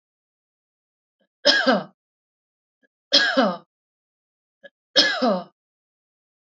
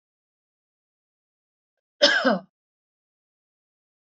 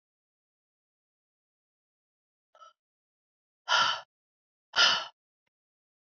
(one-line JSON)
{"three_cough_length": "6.6 s", "three_cough_amplitude": 28557, "three_cough_signal_mean_std_ratio": 0.33, "cough_length": "4.2 s", "cough_amplitude": 23979, "cough_signal_mean_std_ratio": 0.22, "exhalation_length": "6.1 s", "exhalation_amplitude": 10839, "exhalation_signal_mean_std_ratio": 0.23, "survey_phase": "beta (2021-08-13 to 2022-03-07)", "age": "45-64", "gender": "Female", "wearing_mask": "No", "symptom_none": true, "smoker_status": "Never smoked", "respiratory_condition_asthma": false, "respiratory_condition_other": false, "recruitment_source": "REACT", "submission_delay": "2 days", "covid_test_result": "Negative", "covid_test_method": "RT-qPCR", "influenza_a_test_result": "Negative", "influenza_b_test_result": "Negative"}